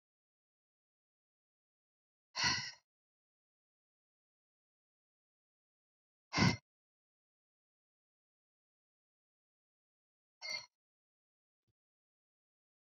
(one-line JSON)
{"exhalation_length": "13.0 s", "exhalation_amplitude": 4211, "exhalation_signal_mean_std_ratio": 0.16, "survey_phase": "beta (2021-08-13 to 2022-03-07)", "age": "45-64", "gender": "Female", "wearing_mask": "No", "symptom_none": true, "symptom_onset": "8 days", "smoker_status": "Never smoked", "respiratory_condition_asthma": false, "respiratory_condition_other": false, "recruitment_source": "REACT", "submission_delay": "1 day", "covid_test_result": "Negative", "covid_test_method": "RT-qPCR"}